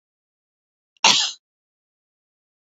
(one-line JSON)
{"cough_length": "2.6 s", "cough_amplitude": 29621, "cough_signal_mean_std_ratio": 0.23, "survey_phase": "beta (2021-08-13 to 2022-03-07)", "age": "45-64", "gender": "Female", "wearing_mask": "No", "symptom_none": true, "smoker_status": "Never smoked", "respiratory_condition_asthma": false, "respiratory_condition_other": false, "recruitment_source": "REACT", "submission_delay": "1 day", "covid_test_result": "Negative", "covid_test_method": "RT-qPCR"}